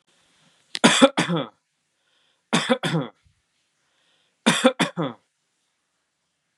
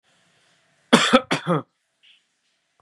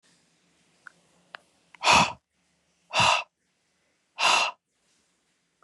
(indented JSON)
{
  "three_cough_length": "6.6 s",
  "three_cough_amplitude": 32724,
  "three_cough_signal_mean_std_ratio": 0.32,
  "cough_length": "2.8 s",
  "cough_amplitude": 32767,
  "cough_signal_mean_std_ratio": 0.29,
  "exhalation_length": "5.6 s",
  "exhalation_amplitude": 17072,
  "exhalation_signal_mean_std_ratio": 0.31,
  "survey_phase": "beta (2021-08-13 to 2022-03-07)",
  "age": "45-64",
  "gender": "Male",
  "wearing_mask": "No",
  "symptom_none": true,
  "smoker_status": "Never smoked",
  "respiratory_condition_asthma": false,
  "respiratory_condition_other": false,
  "recruitment_source": "REACT",
  "submission_delay": "2 days",
  "covid_test_result": "Negative",
  "covid_test_method": "RT-qPCR",
  "influenza_a_test_result": "Negative",
  "influenza_b_test_result": "Negative"
}